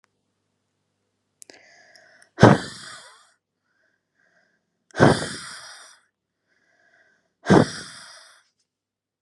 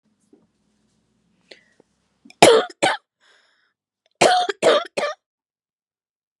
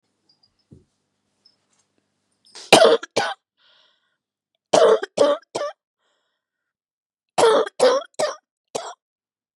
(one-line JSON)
{"exhalation_length": "9.2 s", "exhalation_amplitude": 32768, "exhalation_signal_mean_std_ratio": 0.21, "cough_length": "6.4 s", "cough_amplitude": 32768, "cough_signal_mean_std_ratio": 0.29, "three_cough_length": "9.6 s", "three_cough_amplitude": 32768, "three_cough_signal_mean_std_ratio": 0.32, "survey_phase": "beta (2021-08-13 to 2022-03-07)", "age": "18-44", "gender": "Female", "wearing_mask": "No", "symptom_cough_any": true, "symptom_new_continuous_cough": true, "symptom_runny_or_blocked_nose": true, "symptom_shortness_of_breath": true, "symptom_sore_throat": true, "symptom_fatigue": true, "symptom_headache": true, "symptom_onset": "4 days", "smoker_status": "Never smoked", "respiratory_condition_asthma": false, "respiratory_condition_other": false, "recruitment_source": "Test and Trace", "submission_delay": "2 days", "covid_test_result": "Positive", "covid_test_method": "RT-qPCR", "covid_ct_value": 26.7, "covid_ct_gene": "ORF1ab gene", "covid_ct_mean": 26.9, "covid_viral_load": "1500 copies/ml", "covid_viral_load_category": "Minimal viral load (< 10K copies/ml)"}